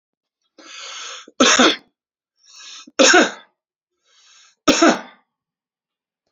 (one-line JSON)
{"three_cough_length": "6.3 s", "three_cough_amplitude": 30402, "three_cough_signal_mean_std_ratio": 0.33, "survey_phase": "beta (2021-08-13 to 2022-03-07)", "age": "45-64", "gender": "Male", "wearing_mask": "No", "symptom_runny_or_blocked_nose": true, "symptom_sore_throat": true, "smoker_status": "Ex-smoker", "respiratory_condition_asthma": false, "respiratory_condition_other": false, "recruitment_source": "Test and Trace", "submission_delay": "2 days", "covid_test_result": "Positive", "covid_test_method": "RT-qPCR", "covid_ct_value": 20.1, "covid_ct_gene": "N gene"}